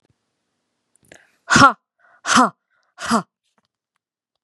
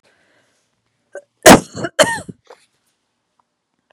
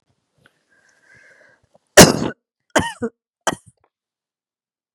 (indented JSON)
{
  "exhalation_length": "4.4 s",
  "exhalation_amplitude": 32768,
  "exhalation_signal_mean_std_ratio": 0.27,
  "cough_length": "3.9 s",
  "cough_amplitude": 32768,
  "cough_signal_mean_std_ratio": 0.22,
  "three_cough_length": "4.9 s",
  "three_cough_amplitude": 32768,
  "three_cough_signal_mean_std_ratio": 0.2,
  "survey_phase": "beta (2021-08-13 to 2022-03-07)",
  "age": "45-64",
  "gender": "Female",
  "wearing_mask": "No",
  "symptom_runny_or_blocked_nose": true,
  "symptom_sore_throat": true,
  "symptom_fatigue": true,
  "symptom_headache": true,
  "symptom_other": true,
  "symptom_onset": "5 days",
  "smoker_status": "Never smoked",
  "respiratory_condition_asthma": false,
  "respiratory_condition_other": false,
  "recruitment_source": "Test and Trace",
  "submission_delay": "2 days",
  "covid_test_result": "Positive",
  "covid_test_method": "RT-qPCR",
  "covid_ct_value": 33.0,
  "covid_ct_gene": "ORF1ab gene",
  "covid_ct_mean": 33.8,
  "covid_viral_load": "8.3 copies/ml",
  "covid_viral_load_category": "Minimal viral load (< 10K copies/ml)"
}